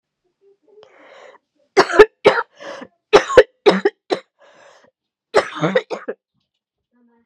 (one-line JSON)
{"three_cough_length": "7.3 s", "three_cough_amplitude": 32768, "three_cough_signal_mean_std_ratio": 0.29, "survey_phase": "beta (2021-08-13 to 2022-03-07)", "age": "18-44", "gender": "Female", "wearing_mask": "No", "symptom_cough_any": true, "symptom_runny_or_blocked_nose": true, "symptom_fatigue": true, "symptom_fever_high_temperature": true, "symptom_headache": true, "smoker_status": "Never smoked", "respiratory_condition_asthma": false, "respiratory_condition_other": false, "recruitment_source": "Test and Trace", "submission_delay": "2 days", "covid_test_result": "Positive", "covid_test_method": "RT-qPCR", "covid_ct_value": 19.3, "covid_ct_gene": "ORF1ab gene", "covid_ct_mean": 19.7, "covid_viral_load": "360000 copies/ml", "covid_viral_load_category": "Low viral load (10K-1M copies/ml)"}